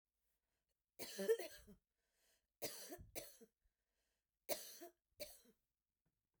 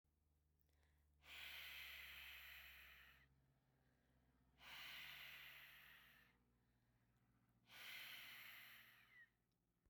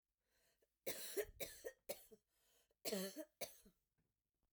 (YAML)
three_cough_length: 6.4 s
three_cough_amplitude: 1582
three_cough_signal_mean_std_ratio: 0.3
exhalation_length: 9.9 s
exhalation_amplitude: 192
exhalation_signal_mean_std_ratio: 0.69
cough_length: 4.5 s
cough_amplitude: 943
cough_signal_mean_std_ratio: 0.4
survey_phase: beta (2021-08-13 to 2022-03-07)
age: 45-64
gender: Female
wearing_mask: 'No'
symptom_none: true
smoker_status: Never smoked
respiratory_condition_asthma: false
respiratory_condition_other: false
recruitment_source: REACT
submission_delay: 1 day
covid_test_result: Negative
covid_test_method: RT-qPCR